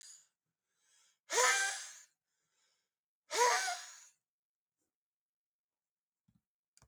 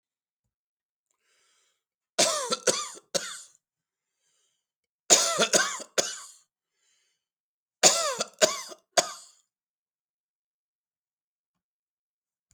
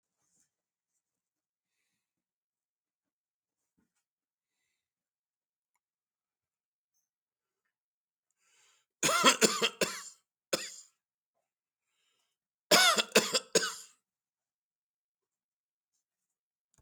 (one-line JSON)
{"exhalation_length": "6.9 s", "exhalation_amplitude": 6013, "exhalation_signal_mean_std_ratio": 0.3, "three_cough_length": "12.5 s", "three_cough_amplitude": 24678, "three_cough_signal_mean_std_ratio": 0.28, "cough_length": "16.8 s", "cough_amplitude": 14949, "cough_signal_mean_std_ratio": 0.21, "survey_phase": "beta (2021-08-13 to 2022-03-07)", "age": "65+", "gender": "Male", "wearing_mask": "No", "symptom_shortness_of_breath": true, "symptom_fatigue": true, "smoker_status": "Never smoked", "respiratory_condition_asthma": false, "respiratory_condition_other": false, "recruitment_source": "Test and Trace", "submission_delay": "1 day", "covid_test_result": "Negative", "covid_test_method": "LFT"}